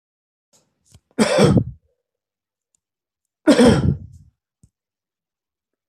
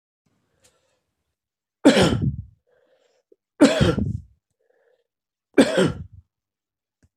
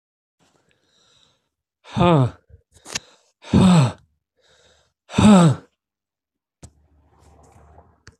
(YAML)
cough_length: 5.9 s
cough_amplitude: 25470
cough_signal_mean_std_ratio: 0.32
three_cough_length: 7.2 s
three_cough_amplitude: 26009
three_cough_signal_mean_std_ratio: 0.32
exhalation_length: 8.2 s
exhalation_amplitude: 24597
exhalation_signal_mean_std_ratio: 0.31
survey_phase: alpha (2021-03-01 to 2021-08-12)
age: 65+
gender: Male
wearing_mask: 'No'
symptom_none: true
smoker_status: Ex-smoker
respiratory_condition_asthma: false
respiratory_condition_other: false
recruitment_source: REACT
submission_delay: 3 days
covid_test_result: Negative
covid_test_method: RT-qPCR